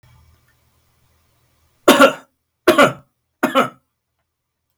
{
  "three_cough_length": "4.8 s",
  "three_cough_amplitude": 32768,
  "three_cough_signal_mean_std_ratio": 0.29,
  "survey_phase": "beta (2021-08-13 to 2022-03-07)",
  "age": "65+",
  "gender": "Male",
  "wearing_mask": "No",
  "symptom_runny_or_blocked_nose": true,
  "symptom_onset": "4 days",
  "smoker_status": "Never smoked",
  "respiratory_condition_asthma": false,
  "respiratory_condition_other": false,
  "recruitment_source": "REACT",
  "submission_delay": "1 day",
  "covid_test_result": "Negative",
  "covid_test_method": "RT-qPCR",
  "influenza_a_test_result": "Unknown/Void",
  "influenza_b_test_result": "Unknown/Void"
}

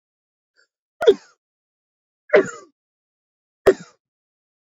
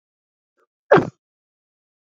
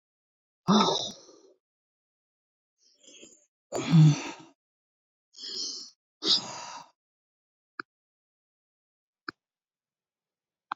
{
  "three_cough_length": "4.8 s",
  "three_cough_amplitude": 27375,
  "three_cough_signal_mean_std_ratio": 0.2,
  "cough_length": "2.0 s",
  "cough_amplitude": 26603,
  "cough_signal_mean_std_ratio": 0.19,
  "exhalation_length": "10.8 s",
  "exhalation_amplitude": 11541,
  "exhalation_signal_mean_std_ratio": 0.26,
  "survey_phase": "beta (2021-08-13 to 2022-03-07)",
  "age": "65+",
  "gender": "Female",
  "wearing_mask": "No",
  "symptom_none": true,
  "symptom_onset": "12 days",
  "smoker_status": "Never smoked",
  "respiratory_condition_asthma": false,
  "respiratory_condition_other": false,
  "recruitment_source": "REACT",
  "submission_delay": "2 days",
  "covid_test_result": "Negative",
  "covid_test_method": "RT-qPCR",
  "influenza_a_test_result": "Negative",
  "influenza_b_test_result": "Negative"
}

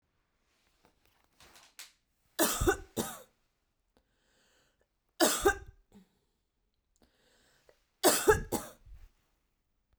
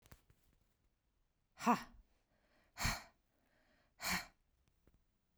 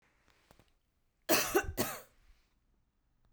{
  "three_cough_length": "10.0 s",
  "three_cough_amplitude": 10377,
  "three_cough_signal_mean_std_ratio": 0.27,
  "exhalation_length": "5.4 s",
  "exhalation_amplitude": 2583,
  "exhalation_signal_mean_std_ratio": 0.26,
  "cough_length": "3.3 s",
  "cough_amplitude": 7442,
  "cough_signal_mean_std_ratio": 0.31,
  "survey_phase": "beta (2021-08-13 to 2022-03-07)",
  "age": "45-64",
  "gender": "Female",
  "wearing_mask": "No",
  "symptom_runny_or_blocked_nose": true,
  "symptom_headache": true,
  "smoker_status": "Never smoked",
  "respiratory_condition_asthma": false,
  "respiratory_condition_other": false,
  "recruitment_source": "Test and Trace",
  "submission_delay": "0 days",
  "covid_test_result": "Negative",
  "covid_test_method": "LFT"
}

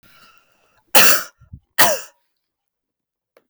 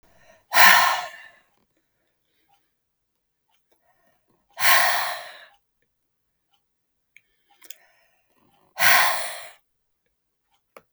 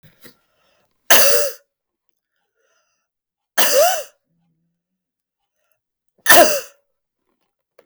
{
  "cough_length": "3.5 s",
  "cough_amplitude": 32768,
  "cough_signal_mean_std_ratio": 0.3,
  "exhalation_length": "10.9 s",
  "exhalation_amplitude": 32768,
  "exhalation_signal_mean_std_ratio": 0.29,
  "three_cough_length": "7.9 s",
  "three_cough_amplitude": 32768,
  "three_cough_signal_mean_std_ratio": 0.31,
  "survey_phase": "beta (2021-08-13 to 2022-03-07)",
  "age": "45-64",
  "gender": "Female",
  "wearing_mask": "No",
  "symptom_runny_or_blocked_nose": true,
  "symptom_fatigue": true,
  "smoker_status": "Never smoked",
  "respiratory_condition_asthma": false,
  "respiratory_condition_other": false,
  "recruitment_source": "REACT",
  "submission_delay": "2 days",
  "covid_test_result": "Positive",
  "covid_test_method": "RT-qPCR",
  "covid_ct_value": 35.0,
  "covid_ct_gene": "N gene",
  "influenza_a_test_result": "Negative",
  "influenza_b_test_result": "Negative"
}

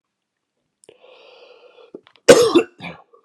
{
  "cough_length": "3.2 s",
  "cough_amplitude": 32768,
  "cough_signal_mean_std_ratio": 0.26,
  "survey_phase": "beta (2021-08-13 to 2022-03-07)",
  "age": "45-64",
  "gender": "Male",
  "wearing_mask": "No",
  "symptom_cough_any": true,
  "symptom_runny_or_blocked_nose": true,
  "symptom_onset": "2 days",
  "smoker_status": "Never smoked",
  "respiratory_condition_asthma": false,
  "respiratory_condition_other": false,
  "recruitment_source": "REACT",
  "submission_delay": "0 days",
  "covid_test_result": "Negative",
  "covid_test_method": "RT-qPCR"
}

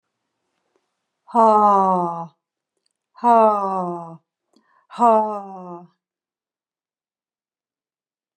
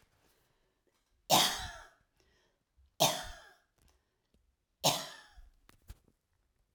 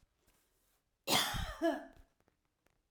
{
  "exhalation_length": "8.4 s",
  "exhalation_amplitude": 23267,
  "exhalation_signal_mean_std_ratio": 0.38,
  "three_cough_length": "6.7 s",
  "three_cough_amplitude": 7675,
  "three_cough_signal_mean_std_ratio": 0.26,
  "cough_length": "2.9 s",
  "cough_amplitude": 7164,
  "cough_signal_mean_std_ratio": 0.38,
  "survey_phase": "alpha (2021-03-01 to 2021-08-12)",
  "age": "45-64",
  "gender": "Female",
  "wearing_mask": "No",
  "symptom_none": true,
  "smoker_status": "Never smoked",
  "respiratory_condition_asthma": false,
  "respiratory_condition_other": false,
  "recruitment_source": "REACT",
  "submission_delay": "1 day",
  "covid_test_result": "Negative",
  "covid_test_method": "RT-qPCR"
}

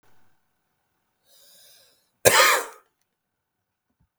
{
  "cough_length": "4.2 s",
  "cough_amplitude": 32768,
  "cough_signal_mean_std_ratio": 0.24,
  "survey_phase": "beta (2021-08-13 to 2022-03-07)",
  "age": "45-64",
  "gender": "Male",
  "wearing_mask": "No",
  "symptom_none": true,
  "smoker_status": "Never smoked",
  "respiratory_condition_asthma": true,
  "respiratory_condition_other": false,
  "recruitment_source": "REACT",
  "submission_delay": "1 day",
  "covid_test_result": "Negative",
  "covid_test_method": "RT-qPCR",
  "influenza_a_test_result": "Negative",
  "influenza_b_test_result": "Negative"
}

